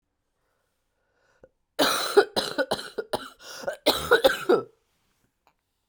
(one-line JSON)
{"cough_length": "5.9 s", "cough_amplitude": 20043, "cough_signal_mean_std_ratio": 0.37, "survey_phase": "alpha (2021-03-01 to 2021-08-12)", "age": "45-64", "gender": "Female", "wearing_mask": "No", "symptom_cough_any": true, "symptom_new_continuous_cough": true, "symptom_abdominal_pain": true, "symptom_diarrhoea": true, "symptom_fatigue": true, "symptom_fever_high_temperature": true, "symptom_headache": true, "symptom_onset": "2 days", "smoker_status": "Ex-smoker", "respiratory_condition_asthma": false, "respiratory_condition_other": false, "recruitment_source": "Test and Trace", "submission_delay": "1 day", "covid_test_result": "Positive", "covid_test_method": "RT-qPCR"}